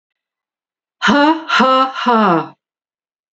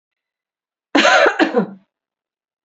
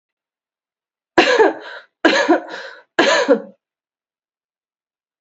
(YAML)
exhalation_length: 3.3 s
exhalation_amplitude: 29919
exhalation_signal_mean_std_ratio: 0.52
cough_length: 2.6 s
cough_amplitude: 32767
cough_signal_mean_std_ratio: 0.4
three_cough_length: 5.2 s
three_cough_amplitude: 30850
three_cough_signal_mean_std_ratio: 0.39
survey_phase: beta (2021-08-13 to 2022-03-07)
age: 45-64
gender: Female
wearing_mask: 'No'
symptom_none: true
smoker_status: Never smoked
respiratory_condition_asthma: false
respiratory_condition_other: false
recruitment_source: REACT
submission_delay: 4 days
covid_test_result: Negative
covid_test_method: RT-qPCR